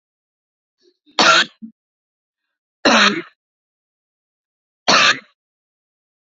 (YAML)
three_cough_length: 6.3 s
three_cough_amplitude: 31100
three_cough_signal_mean_std_ratio: 0.3
survey_phase: beta (2021-08-13 to 2022-03-07)
age: 45-64
gender: Female
wearing_mask: 'No'
symptom_cough_any: true
symptom_runny_or_blocked_nose: true
symptom_sore_throat: true
symptom_fatigue: true
symptom_onset: 12 days
smoker_status: Never smoked
respiratory_condition_asthma: false
respiratory_condition_other: false
recruitment_source: REACT
submission_delay: 2 days
covid_test_result: Negative
covid_test_method: RT-qPCR
influenza_a_test_result: Negative
influenza_b_test_result: Negative